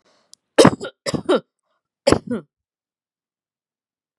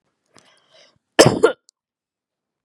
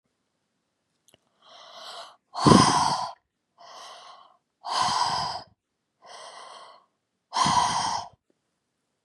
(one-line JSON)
{"three_cough_length": "4.2 s", "three_cough_amplitude": 32768, "three_cough_signal_mean_std_ratio": 0.25, "cough_length": "2.6 s", "cough_amplitude": 32768, "cough_signal_mean_std_ratio": 0.22, "exhalation_length": "9.0 s", "exhalation_amplitude": 28304, "exhalation_signal_mean_std_ratio": 0.37, "survey_phase": "beta (2021-08-13 to 2022-03-07)", "age": "45-64", "gender": "Female", "wearing_mask": "No", "symptom_cough_any": true, "symptom_onset": "12 days", "smoker_status": "Never smoked", "respiratory_condition_asthma": false, "respiratory_condition_other": false, "recruitment_source": "REACT", "submission_delay": "1 day", "covid_test_result": "Negative", "covid_test_method": "RT-qPCR", "influenza_a_test_result": "Negative", "influenza_b_test_result": "Negative"}